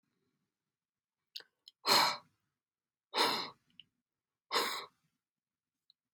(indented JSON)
{
  "exhalation_length": "6.1 s",
  "exhalation_amplitude": 6249,
  "exhalation_signal_mean_std_ratio": 0.29,
  "survey_phase": "beta (2021-08-13 to 2022-03-07)",
  "age": "45-64",
  "gender": "Male",
  "wearing_mask": "No",
  "symptom_cough_any": true,
  "symptom_diarrhoea": true,
  "symptom_headache": true,
  "symptom_onset": "2 days",
  "smoker_status": "Ex-smoker",
  "respiratory_condition_asthma": false,
  "respiratory_condition_other": false,
  "recruitment_source": "Test and Trace",
  "submission_delay": "1 day",
  "covid_test_result": "Positive",
  "covid_test_method": "RT-qPCR",
  "covid_ct_value": 15.9,
  "covid_ct_gene": "ORF1ab gene"
}